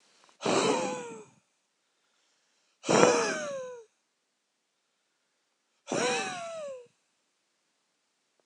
{"exhalation_length": "8.5 s", "exhalation_amplitude": 25681, "exhalation_signal_mean_std_ratio": 0.37, "survey_phase": "beta (2021-08-13 to 2022-03-07)", "age": "45-64", "gender": "Male", "wearing_mask": "No", "symptom_cough_any": true, "symptom_runny_or_blocked_nose": true, "symptom_shortness_of_breath": true, "symptom_sore_throat": true, "symptom_fatigue": true, "symptom_change_to_sense_of_smell_or_taste": true, "symptom_onset": "3 days", "smoker_status": "Ex-smoker", "respiratory_condition_asthma": false, "respiratory_condition_other": false, "recruitment_source": "Test and Trace", "submission_delay": "2 days", "covid_test_result": "Positive", "covid_test_method": "RT-qPCR", "covid_ct_value": 22.1, "covid_ct_gene": "ORF1ab gene"}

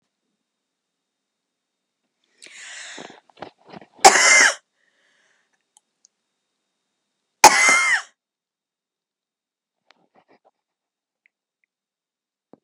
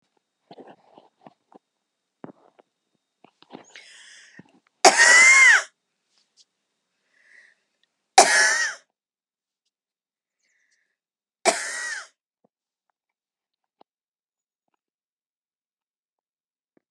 {"cough_length": "12.6 s", "cough_amplitude": 32768, "cough_signal_mean_std_ratio": 0.22, "three_cough_length": "16.9 s", "three_cough_amplitude": 32767, "three_cough_signal_mean_std_ratio": 0.24, "survey_phase": "beta (2021-08-13 to 2022-03-07)", "age": "45-64", "gender": "Female", "wearing_mask": "No", "symptom_fatigue": true, "symptom_headache": true, "symptom_onset": "2 days", "smoker_status": "Current smoker (1 to 10 cigarettes per day)", "respiratory_condition_asthma": false, "respiratory_condition_other": false, "recruitment_source": "Test and Trace", "submission_delay": "2 days", "covid_test_result": "Positive", "covid_test_method": "RT-qPCR", "covid_ct_value": 19.4, "covid_ct_gene": "N gene", "covid_ct_mean": 19.6, "covid_viral_load": "370000 copies/ml", "covid_viral_load_category": "Low viral load (10K-1M copies/ml)"}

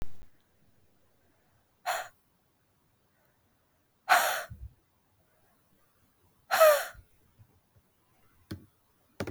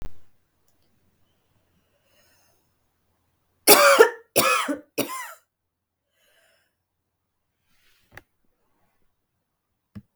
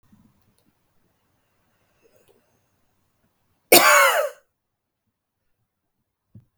{"exhalation_length": "9.3 s", "exhalation_amplitude": 12314, "exhalation_signal_mean_std_ratio": 0.26, "three_cough_length": "10.2 s", "three_cough_amplitude": 32768, "three_cough_signal_mean_std_ratio": 0.23, "cough_length": "6.6 s", "cough_amplitude": 32768, "cough_signal_mean_std_ratio": 0.22, "survey_phase": "beta (2021-08-13 to 2022-03-07)", "age": "18-44", "gender": "Female", "wearing_mask": "No", "symptom_headache": true, "symptom_change_to_sense_of_smell_or_taste": true, "symptom_loss_of_taste": true, "smoker_status": "Never smoked", "respiratory_condition_asthma": true, "respiratory_condition_other": false, "recruitment_source": "Test and Trace", "submission_delay": "2 days", "covid_test_result": "Positive", "covid_test_method": "RT-qPCR", "covid_ct_value": 21.2, "covid_ct_gene": "ORF1ab gene", "covid_ct_mean": 22.0, "covid_viral_load": "62000 copies/ml", "covid_viral_load_category": "Low viral load (10K-1M copies/ml)"}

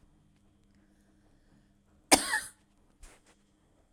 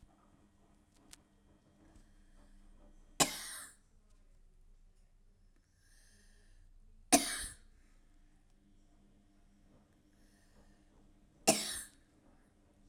{"cough_length": "3.9 s", "cough_amplitude": 26128, "cough_signal_mean_std_ratio": 0.19, "three_cough_length": "12.9 s", "three_cough_amplitude": 9107, "three_cough_signal_mean_std_ratio": 0.23, "survey_phase": "beta (2021-08-13 to 2022-03-07)", "age": "45-64", "gender": "Female", "wearing_mask": "No", "symptom_none": true, "smoker_status": "Never smoked", "respiratory_condition_asthma": true, "respiratory_condition_other": false, "recruitment_source": "REACT", "submission_delay": "2 days", "covid_test_result": "Negative", "covid_test_method": "RT-qPCR"}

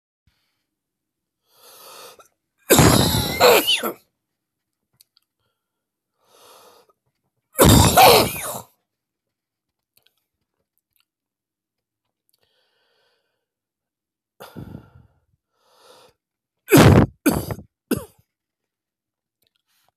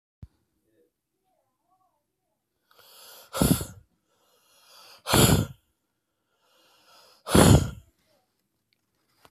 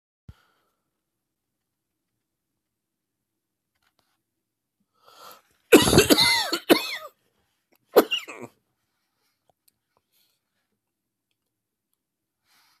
{"three_cough_length": "20.0 s", "three_cough_amplitude": 32767, "three_cough_signal_mean_std_ratio": 0.28, "exhalation_length": "9.3 s", "exhalation_amplitude": 25218, "exhalation_signal_mean_std_ratio": 0.25, "cough_length": "12.8 s", "cough_amplitude": 32767, "cough_signal_mean_std_ratio": 0.21, "survey_phase": "beta (2021-08-13 to 2022-03-07)", "age": "45-64", "gender": "Male", "wearing_mask": "No", "symptom_cough_any": true, "symptom_sore_throat": true, "symptom_abdominal_pain": true, "symptom_fatigue": true, "symptom_headache": true, "symptom_onset": "3 days", "smoker_status": "Ex-smoker", "respiratory_condition_asthma": true, "respiratory_condition_other": false, "recruitment_source": "Test and Trace", "submission_delay": "2 days", "covid_test_result": "Positive", "covid_test_method": "RT-qPCR"}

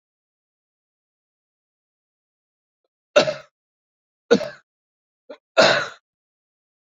{"three_cough_length": "6.9 s", "three_cough_amplitude": 27239, "three_cough_signal_mean_std_ratio": 0.21, "survey_phase": "beta (2021-08-13 to 2022-03-07)", "age": "65+", "gender": "Male", "wearing_mask": "No", "symptom_none": true, "smoker_status": "Never smoked", "respiratory_condition_asthma": false, "respiratory_condition_other": false, "recruitment_source": "REACT", "submission_delay": "2 days", "covid_test_result": "Negative", "covid_test_method": "RT-qPCR"}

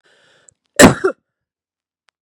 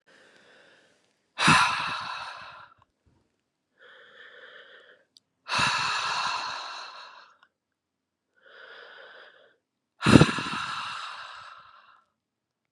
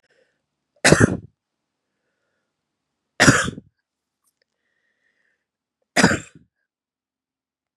{"cough_length": "2.2 s", "cough_amplitude": 32768, "cough_signal_mean_std_ratio": 0.24, "exhalation_length": "12.7 s", "exhalation_amplitude": 32708, "exhalation_signal_mean_std_ratio": 0.33, "three_cough_length": "7.8 s", "three_cough_amplitude": 32768, "three_cough_signal_mean_std_ratio": 0.23, "survey_phase": "beta (2021-08-13 to 2022-03-07)", "age": "45-64", "gender": "Female", "wearing_mask": "No", "symptom_cough_any": true, "symptom_runny_or_blocked_nose": true, "symptom_shortness_of_breath": true, "symptom_sore_throat": true, "symptom_abdominal_pain": true, "symptom_diarrhoea": true, "symptom_fatigue": true, "symptom_fever_high_temperature": true, "symptom_headache": true, "symptom_other": true, "symptom_onset": "4 days", "smoker_status": "Never smoked", "respiratory_condition_asthma": false, "respiratory_condition_other": false, "recruitment_source": "Test and Trace", "submission_delay": "2 days", "covid_test_result": "Positive", "covid_test_method": "RT-qPCR", "covid_ct_value": 21.2, "covid_ct_gene": "N gene", "covid_ct_mean": 21.7, "covid_viral_load": "79000 copies/ml", "covid_viral_load_category": "Low viral load (10K-1M copies/ml)"}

